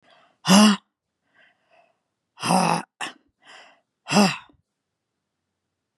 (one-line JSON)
{"exhalation_length": "6.0 s", "exhalation_amplitude": 28973, "exhalation_signal_mean_std_ratio": 0.3, "survey_phase": "beta (2021-08-13 to 2022-03-07)", "age": "65+", "gender": "Female", "wearing_mask": "No", "symptom_cough_any": true, "symptom_runny_or_blocked_nose": true, "symptom_onset": "11 days", "smoker_status": "Never smoked", "respiratory_condition_asthma": false, "respiratory_condition_other": false, "recruitment_source": "REACT", "submission_delay": "1 day", "covid_test_result": "Negative", "covid_test_method": "RT-qPCR", "influenza_a_test_result": "Negative", "influenza_b_test_result": "Negative"}